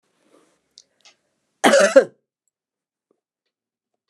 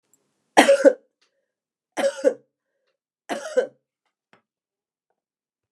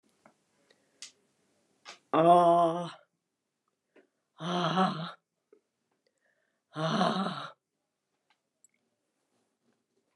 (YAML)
cough_length: 4.1 s
cough_amplitude: 29200
cough_signal_mean_std_ratio: 0.23
three_cough_length: 5.7 s
three_cough_amplitude: 29204
three_cough_signal_mean_std_ratio: 0.26
exhalation_length: 10.2 s
exhalation_amplitude: 10278
exhalation_signal_mean_std_ratio: 0.33
survey_phase: beta (2021-08-13 to 2022-03-07)
age: 65+
gender: Female
wearing_mask: 'No'
symptom_none: true
smoker_status: Never smoked
respiratory_condition_asthma: false
respiratory_condition_other: false
recruitment_source: REACT
submission_delay: 2 days
covid_test_result: Negative
covid_test_method: RT-qPCR